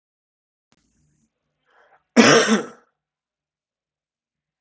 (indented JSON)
{
  "cough_length": "4.6 s",
  "cough_amplitude": 32768,
  "cough_signal_mean_std_ratio": 0.24,
  "survey_phase": "alpha (2021-03-01 to 2021-08-12)",
  "age": "18-44",
  "gender": "Male",
  "wearing_mask": "No",
  "symptom_none": true,
  "smoker_status": "Never smoked",
  "respiratory_condition_asthma": true,
  "respiratory_condition_other": false,
  "recruitment_source": "REACT",
  "submission_delay": "2 days",
  "covid_test_result": "Negative",
  "covid_test_method": "RT-qPCR"
}